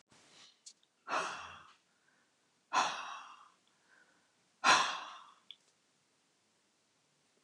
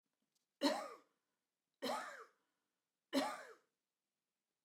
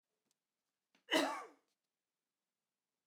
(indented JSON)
{
  "exhalation_length": "7.4 s",
  "exhalation_amplitude": 7672,
  "exhalation_signal_mean_std_ratio": 0.29,
  "three_cough_length": "4.6 s",
  "three_cough_amplitude": 2414,
  "three_cough_signal_mean_std_ratio": 0.33,
  "cough_length": "3.1 s",
  "cough_amplitude": 3108,
  "cough_signal_mean_std_ratio": 0.24,
  "survey_phase": "alpha (2021-03-01 to 2021-08-12)",
  "age": "45-64",
  "gender": "Female",
  "wearing_mask": "No",
  "symptom_none": true,
  "smoker_status": "Never smoked",
  "respiratory_condition_asthma": false,
  "respiratory_condition_other": false,
  "recruitment_source": "REACT",
  "submission_delay": "1 day",
  "covid_test_result": "Negative",
  "covid_test_method": "RT-qPCR"
}